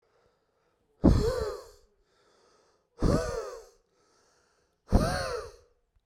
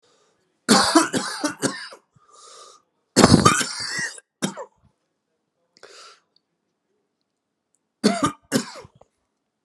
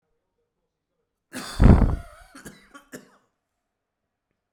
{"exhalation_length": "6.1 s", "exhalation_amplitude": 14540, "exhalation_signal_mean_std_ratio": 0.36, "three_cough_length": "9.6 s", "three_cough_amplitude": 32768, "three_cough_signal_mean_std_ratio": 0.33, "cough_length": "4.5 s", "cough_amplitude": 31758, "cough_signal_mean_std_ratio": 0.23, "survey_phase": "beta (2021-08-13 to 2022-03-07)", "age": "18-44", "gender": "Male", "wearing_mask": "No", "symptom_cough_any": true, "symptom_runny_or_blocked_nose": true, "symptom_shortness_of_breath": true, "symptom_sore_throat": true, "symptom_headache": true, "symptom_onset": "4 days", "smoker_status": "Never smoked", "respiratory_condition_asthma": false, "respiratory_condition_other": false, "recruitment_source": "REACT", "submission_delay": "1 day", "covid_test_result": "Negative", "covid_test_method": "RT-qPCR"}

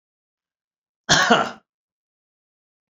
{"cough_length": "2.9 s", "cough_amplitude": 27954, "cough_signal_mean_std_ratio": 0.28, "survey_phase": "beta (2021-08-13 to 2022-03-07)", "age": "65+", "gender": "Male", "wearing_mask": "No", "symptom_runny_or_blocked_nose": true, "symptom_abdominal_pain": true, "smoker_status": "Ex-smoker", "respiratory_condition_asthma": false, "respiratory_condition_other": false, "recruitment_source": "REACT", "submission_delay": "2 days", "covid_test_result": "Negative", "covid_test_method": "RT-qPCR"}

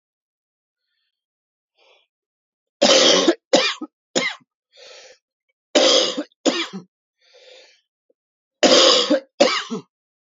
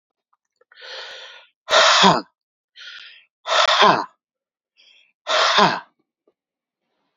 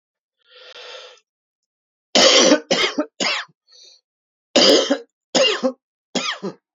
{"three_cough_length": "10.3 s", "three_cough_amplitude": 31203, "three_cough_signal_mean_std_ratio": 0.38, "exhalation_length": "7.2 s", "exhalation_amplitude": 32767, "exhalation_signal_mean_std_ratio": 0.39, "cough_length": "6.7 s", "cough_amplitude": 31590, "cough_signal_mean_std_ratio": 0.42, "survey_phase": "alpha (2021-03-01 to 2021-08-12)", "age": "45-64", "gender": "Male", "wearing_mask": "No", "symptom_cough_any": true, "symptom_new_continuous_cough": true, "symptom_diarrhoea": true, "symptom_fatigue": true, "symptom_fever_high_temperature": true, "symptom_change_to_sense_of_smell_or_taste": true, "symptom_loss_of_taste": true, "smoker_status": "Never smoked", "respiratory_condition_asthma": false, "respiratory_condition_other": false, "recruitment_source": "Test and Trace", "submission_delay": "2 days", "covid_test_result": "Positive", "covid_test_method": "RT-qPCR"}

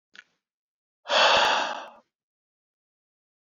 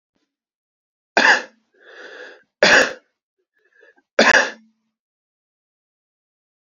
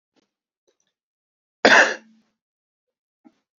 {"exhalation_length": "3.5 s", "exhalation_amplitude": 15125, "exhalation_signal_mean_std_ratio": 0.35, "three_cough_length": "6.7 s", "three_cough_amplitude": 29363, "three_cough_signal_mean_std_ratio": 0.28, "cough_length": "3.6 s", "cough_amplitude": 32767, "cough_signal_mean_std_ratio": 0.21, "survey_phase": "alpha (2021-03-01 to 2021-08-12)", "age": "18-44", "gender": "Male", "wearing_mask": "No", "symptom_fatigue": true, "symptom_headache": true, "smoker_status": "Ex-smoker", "respiratory_condition_asthma": false, "respiratory_condition_other": false, "recruitment_source": "Test and Trace", "submission_delay": "1 day", "covid_test_result": "Positive", "covid_test_method": "RT-qPCR"}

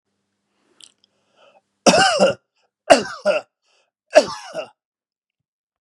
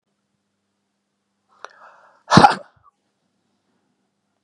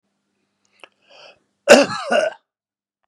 {"three_cough_length": "5.8 s", "three_cough_amplitude": 32768, "three_cough_signal_mean_std_ratio": 0.3, "exhalation_length": "4.4 s", "exhalation_amplitude": 32768, "exhalation_signal_mean_std_ratio": 0.17, "cough_length": "3.1 s", "cough_amplitude": 32768, "cough_signal_mean_std_ratio": 0.28, "survey_phase": "beta (2021-08-13 to 2022-03-07)", "age": "65+", "gender": "Male", "wearing_mask": "No", "symptom_none": true, "smoker_status": "Ex-smoker", "respiratory_condition_asthma": true, "respiratory_condition_other": false, "recruitment_source": "REACT", "submission_delay": "1 day", "covid_test_result": "Negative", "covid_test_method": "RT-qPCR", "influenza_a_test_result": "Negative", "influenza_b_test_result": "Negative"}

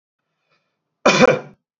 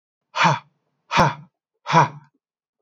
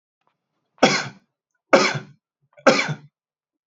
{"cough_length": "1.8 s", "cough_amplitude": 32767, "cough_signal_mean_std_ratio": 0.33, "exhalation_length": "2.8 s", "exhalation_amplitude": 30593, "exhalation_signal_mean_std_ratio": 0.37, "three_cough_length": "3.7 s", "three_cough_amplitude": 28475, "three_cough_signal_mean_std_ratio": 0.32, "survey_phase": "beta (2021-08-13 to 2022-03-07)", "age": "45-64", "gender": "Male", "wearing_mask": "No", "symptom_cough_any": true, "smoker_status": "Never smoked", "respiratory_condition_asthma": false, "respiratory_condition_other": false, "recruitment_source": "REACT", "submission_delay": "4 days", "covid_test_result": "Negative", "covid_test_method": "RT-qPCR", "influenza_a_test_result": "Negative", "influenza_b_test_result": "Negative"}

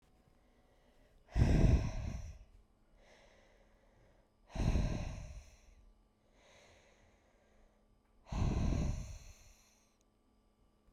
{"exhalation_length": "10.9 s", "exhalation_amplitude": 4805, "exhalation_signal_mean_std_ratio": 0.38, "survey_phase": "beta (2021-08-13 to 2022-03-07)", "age": "18-44", "gender": "Female", "wearing_mask": "No", "symptom_cough_any": true, "symptom_fatigue": true, "symptom_fever_high_temperature": true, "symptom_headache": true, "smoker_status": "Never smoked", "respiratory_condition_asthma": false, "respiratory_condition_other": false, "recruitment_source": "Test and Trace", "submission_delay": "1 day", "covid_test_result": "Positive", "covid_test_method": "RT-qPCR", "covid_ct_value": 16.4, "covid_ct_gene": "ORF1ab gene", "covid_ct_mean": 16.9, "covid_viral_load": "2900000 copies/ml", "covid_viral_load_category": "High viral load (>1M copies/ml)"}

